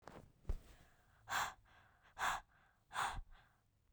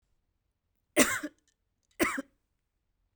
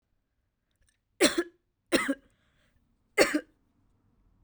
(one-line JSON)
{"exhalation_length": "3.9 s", "exhalation_amplitude": 1604, "exhalation_signal_mean_std_ratio": 0.43, "cough_length": "3.2 s", "cough_amplitude": 13025, "cough_signal_mean_std_ratio": 0.26, "three_cough_length": "4.4 s", "three_cough_amplitude": 16463, "three_cough_signal_mean_std_ratio": 0.27, "survey_phase": "alpha (2021-03-01 to 2021-08-12)", "age": "18-44", "gender": "Female", "wearing_mask": "No", "symptom_fatigue": true, "symptom_fever_high_temperature": true, "symptom_headache": true, "symptom_onset": "4 days", "smoker_status": "Never smoked", "respiratory_condition_asthma": false, "respiratory_condition_other": false, "recruitment_source": "Test and Trace", "submission_delay": "2 days", "covid_test_result": "Positive", "covid_test_method": "RT-qPCR", "covid_ct_value": 22.8, "covid_ct_gene": "N gene", "covid_ct_mean": 23.3, "covid_viral_load": "23000 copies/ml", "covid_viral_load_category": "Low viral load (10K-1M copies/ml)"}